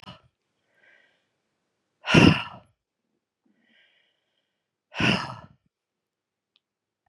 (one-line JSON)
{"exhalation_length": "7.1 s", "exhalation_amplitude": 24420, "exhalation_signal_mean_std_ratio": 0.21, "survey_phase": "beta (2021-08-13 to 2022-03-07)", "age": "45-64", "gender": "Female", "wearing_mask": "No", "symptom_cough_any": true, "symptom_new_continuous_cough": true, "symptom_runny_or_blocked_nose": true, "symptom_shortness_of_breath": true, "symptom_sore_throat": true, "symptom_fatigue": true, "symptom_change_to_sense_of_smell_or_taste": true, "symptom_loss_of_taste": true, "symptom_other": true, "symptom_onset": "6 days", "smoker_status": "Never smoked", "respiratory_condition_asthma": false, "respiratory_condition_other": false, "recruitment_source": "Test and Trace", "submission_delay": "1 day", "covid_test_result": "Negative", "covid_test_method": "ePCR"}